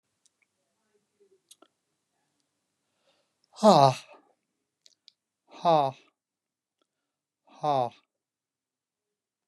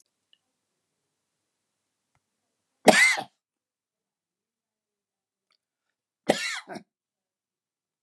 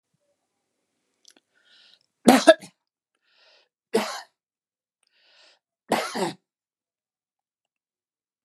exhalation_length: 9.5 s
exhalation_amplitude: 17555
exhalation_signal_mean_std_ratio: 0.21
cough_length: 8.0 s
cough_amplitude: 29106
cough_signal_mean_std_ratio: 0.18
three_cough_length: 8.4 s
three_cough_amplitude: 32768
three_cough_signal_mean_std_ratio: 0.19
survey_phase: beta (2021-08-13 to 2022-03-07)
age: 65+
gender: Male
wearing_mask: 'No'
symptom_none: true
smoker_status: Never smoked
respiratory_condition_asthma: false
respiratory_condition_other: false
recruitment_source: REACT
submission_delay: 3 days
covid_test_result: Negative
covid_test_method: RT-qPCR
influenza_a_test_result: Negative
influenza_b_test_result: Negative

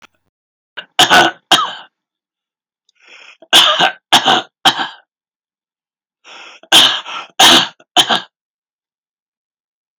three_cough_length: 10.0 s
three_cough_amplitude: 32768
three_cough_signal_mean_std_ratio: 0.37
survey_phase: beta (2021-08-13 to 2022-03-07)
age: 65+
gender: Male
wearing_mask: 'No'
symptom_none: true
smoker_status: Never smoked
respiratory_condition_asthma: false
respiratory_condition_other: false
recruitment_source: REACT
submission_delay: 1 day
covid_test_result: Negative
covid_test_method: RT-qPCR
influenza_a_test_result: Negative
influenza_b_test_result: Negative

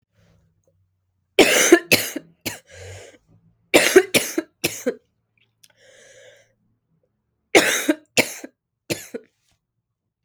three_cough_length: 10.2 s
three_cough_amplitude: 32768
three_cough_signal_mean_std_ratio: 0.3
survey_phase: beta (2021-08-13 to 2022-03-07)
age: 18-44
gender: Female
wearing_mask: 'No'
symptom_cough_any: true
symptom_runny_or_blocked_nose: true
symptom_fatigue: true
symptom_headache: true
symptom_change_to_sense_of_smell_or_taste: true
symptom_loss_of_taste: true
symptom_other: true
symptom_onset: 3 days
smoker_status: Never smoked
respiratory_condition_asthma: false
respiratory_condition_other: false
recruitment_source: REACT
submission_delay: 1 day
covid_test_result: Negative
covid_test_method: RT-qPCR
influenza_a_test_result: Negative
influenza_b_test_result: Negative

